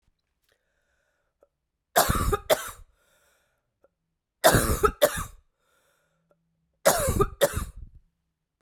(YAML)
three_cough_length: 8.6 s
three_cough_amplitude: 23725
three_cough_signal_mean_std_ratio: 0.34
survey_phase: beta (2021-08-13 to 2022-03-07)
age: 45-64
gender: Female
wearing_mask: 'No'
symptom_cough_any: true
symptom_runny_or_blocked_nose: true
symptom_shortness_of_breath: true
symptom_sore_throat: true
symptom_abdominal_pain: true
symptom_fatigue: true
symptom_headache: true
symptom_change_to_sense_of_smell_or_taste: true
symptom_other: true
symptom_onset: 4 days
smoker_status: Ex-smoker
respiratory_condition_asthma: false
respiratory_condition_other: false
recruitment_source: Test and Trace
submission_delay: 2 days
covid_test_result: Positive
covid_test_method: RT-qPCR
covid_ct_value: 18.3
covid_ct_gene: ORF1ab gene
covid_ct_mean: 18.8
covid_viral_load: 680000 copies/ml
covid_viral_load_category: Low viral load (10K-1M copies/ml)